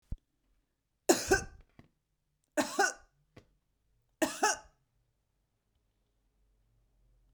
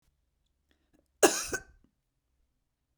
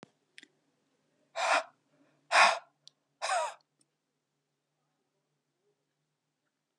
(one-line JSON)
{"three_cough_length": "7.3 s", "three_cough_amplitude": 11254, "three_cough_signal_mean_std_ratio": 0.25, "cough_length": "3.0 s", "cough_amplitude": 16270, "cough_signal_mean_std_ratio": 0.19, "exhalation_length": "6.8 s", "exhalation_amplitude": 12389, "exhalation_signal_mean_std_ratio": 0.25, "survey_phase": "beta (2021-08-13 to 2022-03-07)", "age": "45-64", "gender": "Female", "wearing_mask": "No", "symptom_none": true, "smoker_status": "Never smoked", "respiratory_condition_asthma": false, "respiratory_condition_other": false, "recruitment_source": "REACT", "submission_delay": "1 day", "covid_test_result": "Negative", "covid_test_method": "RT-qPCR"}